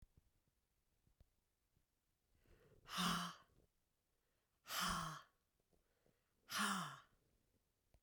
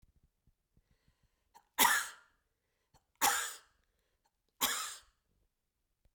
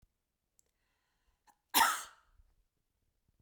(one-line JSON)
{"exhalation_length": "8.0 s", "exhalation_amplitude": 1252, "exhalation_signal_mean_std_ratio": 0.35, "three_cough_length": "6.1 s", "three_cough_amplitude": 7991, "three_cough_signal_mean_std_ratio": 0.28, "cough_length": "3.4 s", "cough_amplitude": 7543, "cough_signal_mean_std_ratio": 0.21, "survey_phase": "beta (2021-08-13 to 2022-03-07)", "age": "45-64", "gender": "Female", "wearing_mask": "No", "symptom_none": true, "smoker_status": "Never smoked", "respiratory_condition_asthma": false, "respiratory_condition_other": false, "recruitment_source": "REACT", "submission_delay": "1 day", "covid_test_result": "Negative", "covid_test_method": "RT-qPCR"}